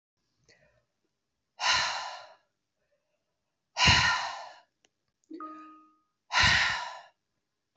exhalation_length: 7.8 s
exhalation_amplitude: 13058
exhalation_signal_mean_std_ratio: 0.37
survey_phase: alpha (2021-03-01 to 2021-08-12)
age: 45-64
gender: Female
wearing_mask: 'No'
symptom_cough_any: true
symptom_headache: true
symptom_onset: 9 days
smoker_status: Never smoked
respiratory_condition_asthma: false
respiratory_condition_other: false
recruitment_source: Test and Trace
submission_delay: 2 days
covid_test_result: Positive
covid_test_method: RT-qPCR
covid_ct_value: 23.4
covid_ct_gene: ORF1ab gene
covid_ct_mean: 24.4
covid_viral_load: 9700 copies/ml
covid_viral_load_category: Minimal viral load (< 10K copies/ml)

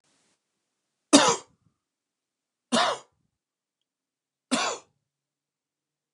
three_cough_length: 6.1 s
three_cough_amplitude: 28823
three_cough_signal_mean_std_ratio: 0.24
survey_phase: alpha (2021-03-01 to 2021-08-12)
age: 45-64
gender: Male
wearing_mask: 'No'
symptom_none: true
smoker_status: Never smoked
respiratory_condition_asthma: false
respiratory_condition_other: false
recruitment_source: REACT
submission_delay: 5 days
covid_test_result: Negative
covid_test_method: RT-qPCR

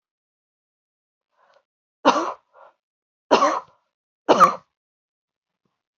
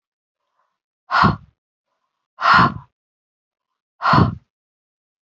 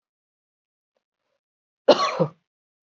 three_cough_length: 6.0 s
three_cough_amplitude: 27917
three_cough_signal_mean_std_ratio: 0.25
exhalation_length: 5.3 s
exhalation_amplitude: 27196
exhalation_signal_mean_std_ratio: 0.32
cough_length: 2.9 s
cough_amplitude: 32191
cough_signal_mean_std_ratio: 0.23
survey_phase: beta (2021-08-13 to 2022-03-07)
age: 18-44
gender: Female
wearing_mask: 'No'
symptom_cough_any: true
symptom_runny_or_blocked_nose: true
symptom_fatigue: true
symptom_headache: true
symptom_other: true
smoker_status: Ex-smoker
respiratory_condition_asthma: false
respiratory_condition_other: false
recruitment_source: Test and Trace
submission_delay: 2 days
covid_test_result: Positive
covid_test_method: RT-qPCR
covid_ct_value: 16.5
covid_ct_gene: ORF1ab gene
covid_ct_mean: 16.9
covid_viral_load: 2800000 copies/ml
covid_viral_load_category: High viral load (>1M copies/ml)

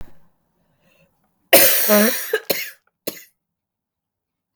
cough_length: 4.6 s
cough_amplitude: 32768
cough_signal_mean_std_ratio: 0.35
survey_phase: beta (2021-08-13 to 2022-03-07)
age: 18-44
gender: Female
wearing_mask: 'No'
symptom_cough_any: true
symptom_new_continuous_cough: true
symptom_runny_or_blocked_nose: true
symptom_shortness_of_breath: true
symptom_onset: 5 days
smoker_status: Never smoked
respiratory_condition_asthma: true
respiratory_condition_other: false
recruitment_source: Test and Trace
submission_delay: 2 days
covid_test_result: Positive
covid_test_method: RT-qPCR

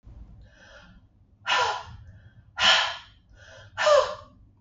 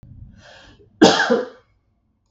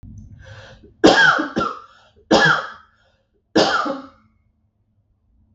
exhalation_length: 4.6 s
exhalation_amplitude: 16035
exhalation_signal_mean_std_ratio: 0.41
cough_length: 2.3 s
cough_amplitude: 32768
cough_signal_mean_std_ratio: 0.34
three_cough_length: 5.5 s
three_cough_amplitude: 32768
three_cough_signal_mean_std_ratio: 0.4
survey_phase: beta (2021-08-13 to 2022-03-07)
age: 45-64
gender: Female
wearing_mask: 'No'
symptom_cough_any: true
symptom_runny_or_blocked_nose: true
symptom_sore_throat: true
symptom_onset: 3 days
smoker_status: Never smoked
respiratory_condition_asthma: false
respiratory_condition_other: false
recruitment_source: Test and Trace
submission_delay: 2 days
covid_test_result: Positive
covid_test_method: RT-qPCR
covid_ct_value: 16.6
covid_ct_gene: ORF1ab gene
covid_ct_mean: 16.9
covid_viral_load: 2900000 copies/ml
covid_viral_load_category: High viral load (>1M copies/ml)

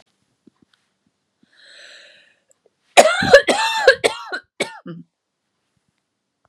three_cough_length: 6.5 s
three_cough_amplitude: 32768
three_cough_signal_mean_std_ratio: 0.28
survey_phase: beta (2021-08-13 to 2022-03-07)
age: 18-44
gender: Female
wearing_mask: 'No'
symptom_cough_any: true
symptom_runny_or_blocked_nose: true
symptom_shortness_of_breath: true
symptom_fatigue: true
symptom_headache: true
symptom_onset: 2 days
smoker_status: Never smoked
respiratory_condition_asthma: true
respiratory_condition_other: false
recruitment_source: Test and Trace
submission_delay: 2 days
covid_test_result: Positive
covid_test_method: RT-qPCR
covid_ct_value: 24.3
covid_ct_gene: N gene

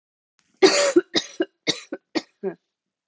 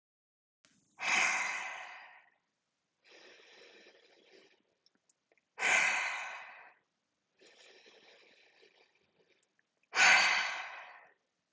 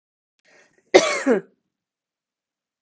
three_cough_length: 3.1 s
three_cough_amplitude: 26309
three_cough_signal_mean_std_ratio: 0.35
exhalation_length: 11.5 s
exhalation_amplitude: 7415
exhalation_signal_mean_std_ratio: 0.34
cough_length: 2.8 s
cough_amplitude: 32768
cough_signal_mean_std_ratio: 0.26
survey_phase: beta (2021-08-13 to 2022-03-07)
age: 18-44
gender: Female
wearing_mask: 'No'
symptom_sore_throat: true
smoker_status: Ex-smoker
respiratory_condition_asthma: false
respiratory_condition_other: false
recruitment_source: REACT
submission_delay: 0 days
covid_test_result: Negative
covid_test_method: RT-qPCR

